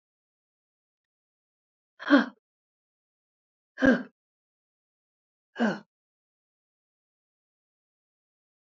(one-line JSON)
{"exhalation_length": "8.8 s", "exhalation_amplitude": 16117, "exhalation_signal_mean_std_ratio": 0.18, "survey_phase": "alpha (2021-03-01 to 2021-08-12)", "age": "45-64", "gender": "Female", "wearing_mask": "No", "symptom_none": true, "smoker_status": "Ex-smoker", "respiratory_condition_asthma": false, "respiratory_condition_other": false, "recruitment_source": "REACT", "submission_delay": "2 days", "covid_test_result": "Negative", "covid_test_method": "RT-qPCR"}